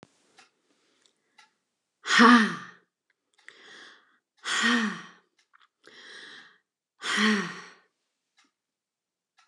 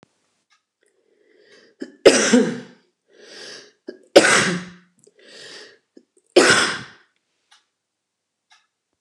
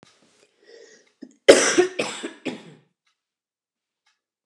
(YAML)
exhalation_length: 9.5 s
exhalation_amplitude: 23686
exhalation_signal_mean_std_ratio: 0.29
three_cough_length: 9.0 s
three_cough_amplitude: 29204
three_cough_signal_mean_std_ratio: 0.3
cough_length: 4.5 s
cough_amplitude: 29204
cough_signal_mean_std_ratio: 0.25
survey_phase: beta (2021-08-13 to 2022-03-07)
age: 45-64
gender: Female
wearing_mask: 'No'
symptom_none: true
smoker_status: Never smoked
respiratory_condition_asthma: false
respiratory_condition_other: false
recruitment_source: REACT
submission_delay: 0 days
covid_test_result: Negative
covid_test_method: RT-qPCR